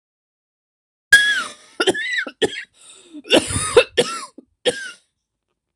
{"cough_length": "5.8 s", "cough_amplitude": 26028, "cough_signal_mean_std_ratio": 0.39, "survey_phase": "beta (2021-08-13 to 2022-03-07)", "age": "65+", "gender": "Female", "wearing_mask": "No", "symptom_runny_or_blocked_nose": true, "smoker_status": "Never smoked", "respiratory_condition_asthma": true, "respiratory_condition_other": false, "recruitment_source": "REACT", "submission_delay": "2 days", "covid_test_result": "Negative", "covid_test_method": "RT-qPCR"}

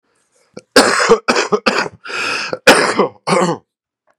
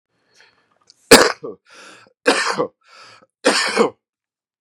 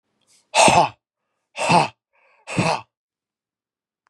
{"cough_length": "4.2 s", "cough_amplitude": 32768, "cough_signal_mean_std_ratio": 0.53, "three_cough_length": "4.6 s", "three_cough_amplitude": 32768, "three_cough_signal_mean_std_ratio": 0.33, "exhalation_length": "4.1 s", "exhalation_amplitude": 30773, "exhalation_signal_mean_std_ratio": 0.35, "survey_phase": "beta (2021-08-13 to 2022-03-07)", "age": "18-44", "gender": "Male", "wearing_mask": "No", "symptom_runny_or_blocked_nose": true, "symptom_diarrhoea": true, "smoker_status": "Ex-smoker", "respiratory_condition_asthma": false, "respiratory_condition_other": false, "recruitment_source": "Test and Trace", "submission_delay": "1 day", "covid_test_result": "Positive", "covid_test_method": "RT-qPCR", "covid_ct_value": 17.2, "covid_ct_gene": "N gene"}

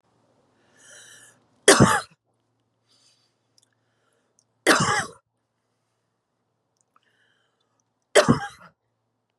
{"three_cough_length": "9.4 s", "three_cough_amplitude": 28941, "three_cough_signal_mean_std_ratio": 0.23, "survey_phase": "beta (2021-08-13 to 2022-03-07)", "age": "45-64", "gender": "Female", "wearing_mask": "No", "symptom_runny_or_blocked_nose": true, "symptom_abdominal_pain": true, "symptom_diarrhoea": true, "symptom_fatigue": true, "symptom_headache": true, "symptom_change_to_sense_of_smell_or_taste": true, "symptom_onset": "2 days", "smoker_status": "Ex-smoker", "respiratory_condition_asthma": false, "respiratory_condition_other": false, "recruitment_source": "Test and Trace", "submission_delay": "2 days", "covid_test_result": "Positive", "covid_test_method": "RT-qPCR", "covid_ct_value": 18.2, "covid_ct_gene": "ORF1ab gene", "covid_ct_mean": 18.7, "covid_viral_load": "740000 copies/ml", "covid_viral_load_category": "Low viral load (10K-1M copies/ml)"}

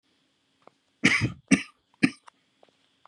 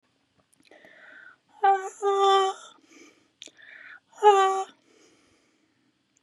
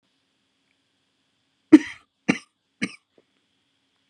{"three_cough_length": "3.1 s", "three_cough_amplitude": 19066, "three_cough_signal_mean_std_ratio": 0.27, "exhalation_length": "6.2 s", "exhalation_amplitude": 18943, "exhalation_signal_mean_std_ratio": 0.35, "cough_length": "4.1 s", "cough_amplitude": 32020, "cough_signal_mean_std_ratio": 0.13, "survey_phase": "beta (2021-08-13 to 2022-03-07)", "age": "18-44", "gender": "Female", "wearing_mask": "No", "symptom_none": true, "smoker_status": "Never smoked", "respiratory_condition_asthma": false, "respiratory_condition_other": false, "recruitment_source": "REACT", "submission_delay": "2 days", "covid_test_result": "Negative", "covid_test_method": "RT-qPCR", "influenza_a_test_result": "Negative", "influenza_b_test_result": "Negative"}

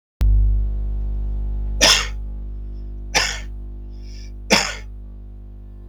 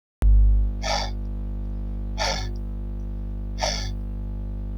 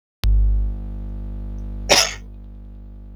{"three_cough_length": "5.9 s", "three_cough_amplitude": 32766, "three_cough_signal_mean_std_ratio": 0.77, "exhalation_length": "4.8 s", "exhalation_amplitude": 11169, "exhalation_signal_mean_std_ratio": 0.98, "cough_length": "3.2 s", "cough_amplitude": 32737, "cough_signal_mean_std_ratio": 0.7, "survey_phase": "beta (2021-08-13 to 2022-03-07)", "age": "45-64", "gender": "Male", "wearing_mask": "No", "symptom_none": true, "smoker_status": "Never smoked", "respiratory_condition_asthma": false, "respiratory_condition_other": false, "recruitment_source": "REACT", "submission_delay": "1 day", "covid_test_result": "Negative", "covid_test_method": "RT-qPCR", "influenza_a_test_result": "Negative", "influenza_b_test_result": "Negative"}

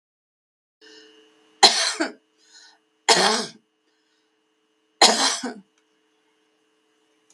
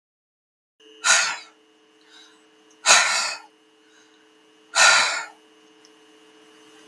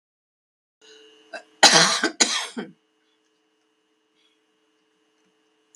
{"three_cough_length": "7.3 s", "three_cough_amplitude": 32485, "three_cough_signal_mean_std_ratio": 0.29, "exhalation_length": "6.9 s", "exhalation_amplitude": 32245, "exhalation_signal_mean_std_ratio": 0.34, "cough_length": "5.8 s", "cough_amplitude": 32768, "cough_signal_mean_std_ratio": 0.25, "survey_phase": "beta (2021-08-13 to 2022-03-07)", "age": "65+", "gender": "Female", "wearing_mask": "No", "symptom_cough_any": true, "symptom_shortness_of_breath": true, "smoker_status": "Never smoked", "respiratory_condition_asthma": true, "respiratory_condition_other": false, "recruitment_source": "REACT", "submission_delay": "3 days", "covid_test_result": "Negative", "covid_test_method": "RT-qPCR", "influenza_a_test_result": "Negative", "influenza_b_test_result": "Negative"}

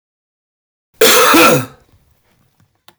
{"cough_length": "3.0 s", "cough_amplitude": 32768, "cough_signal_mean_std_ratio": 0.42, "survey_phase": "beta (2021-08-13 to 2022-03-07)", "age": "45-64", "gender": "Male", "wearing_mask": "No", "symptom_none": true, "smoker_status": "Never smoked", "respiratory_condition_asthma": false, "respiratory_condition_other": false, "recruitment_source": "REACT", "submission_delay": "2 days", "covid_test_result": "Negative", "covid_test_method": "RT-qPCR", "influenza_a_test_result": "Negative", "influenza_b_test_result": "Negative"}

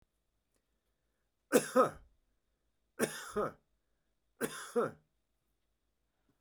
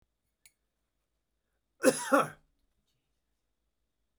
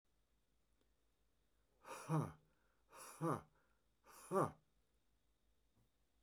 {"three_cough_length": "6.4 s", "three_cough_amplitude": 6864, "three_cough_signal_mean_std_ratio": 0.27, "cough_length": "4.2 s", "cough_amplitude": 9608, "cough_signal_mean_std_ratio": 0.21, "exhalation_length": "6.2 s", "exhalation_amplitude": 1756, "exhalation_signal_mean_std_ratio": 0.29, "survey_phase": "beta (2021-08-13 to 2022-03-07)", "age": "45-64", "gender": "Male", "wearing_mask": "No", "symptom_none": true, "smoker_status": "Never smoked", "respiratory_condition_asthma": false, "respiratory_condition_other": false, "recruitment_source": "REACT", "submission_delay": "2 days", "covid_test_result": "Negative", "covid_test_method": "RT-qPCR"}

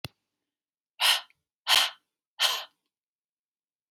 {"exhalation_length": "3.9 s", "exhalation_amplitude": 13570, "exhalation_signal_mean_std_ratio": 0.3, "survey_phase": "beta (2021-08-13 to 2022-03-07)", "age": "18-44", "gender": "Female", "wearing_mask": "No", "symptom_none": true, "smoker_status": "Never smoked", "respiratory_condition_asthma": false, "respiratory_condition_other": false, "recruitment_source": "REACT", "submission_delay": "7 days", "covid_test_result": "Negative", "covid_test_method": "RT-qPCR", "influenza_a_test_result": "Negative", "influenza_b_test_result": "Negative"}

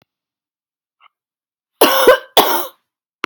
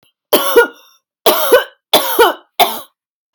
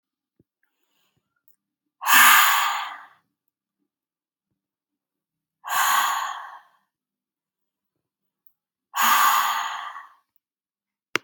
{"cough_length": "3.3 s", "cough_amplitude": 32768, "cough_signal_mean_std_ratio": 0.34, "three_cough_length": "3.3 s", "three_cough_amplitude": 32768, "three_cough_signal_mean_std_ratio": 0.49, "exhalation_length": "11.2 s", "exhalation_amplitude": 31677, "exhalation_signal_mean_std_ratio": 0.35, "survey_phase": "beta (2021-08-13 to 2022-03-07)", "age": "18-44", "gender": "Female", "wearing_mask": "No", "symptom_cough_any": true, "symptom_runny_or_blocked_nose": true, "symptom_onset": "13 days", "smoker_status": "Never smoked", "respiratory_condition_asthma": true, "respiratory_condition_other": false, "recruitment_source": "REACT", "submission_delay": "3 days", "covid_test_result": "Negative", "covid_test_method": "RT-qPCR", "influenza_a_test_result": "Negative", "influenza_b_test_result": "Negative"}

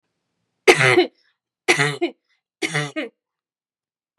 {"three_cough_length": "4.2 s", "three_cough_amplitude": 32768, "three_cough_signal_mean_std_ratio": 0.35, "survey_phase": "beta (2021-08-13 to 2022-03-07)", "age": "18-44", "gender": "Female", "wearing_mask": "No", "symptom_cough_any": true, "symptom_runny_or_blocked_nose": true, "symptom_onset": "12 days", "smoker_status": "Ex-smoker", "respiratory_condition_asthma": false, "respiratory_condition_other": false, "recruitment_source": "REACT", "submission_delay": "2 days", "covid_test_result": "Negative", "covid_test_method": "RT-qPCR", "influenza_a_test_result": "Negative", "influenza_b_test_result": "Negative"}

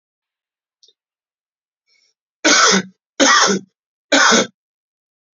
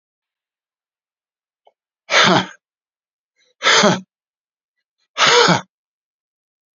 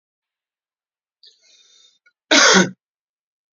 {"three_cough_length": "5.4 s", "three_cough_amplitude": 32421, "three_cough_signal_mean_std_ratio": 0.38, "exhalation_length": "6.7 s", "exhalation_amplitude": 32768, "exhalation_signal_mean_std_ratio": 0.33, "cough_length": "3.6 s", "cough_amplitude": 31107, "cough_signal_mean_std_ratio": 0.26, "survey_phase": "beta (2021-08-13 to 2022-03-07)", "age": "45-64", "gender": "Male", "wearing_mask": "No", "symptom_none": true, "smoker_status": "Never smoked", "respiratory_condition_asthma": false, "respiratory_condition_other": false, "recruitment_source": "REACT", "submission_delay": "2 days", "covid_test_result": "Negative", "covid_test_method": "RT-qPCR", "influenza_a_test_result": "Negative", "influenza_b_test_result": "Negative"}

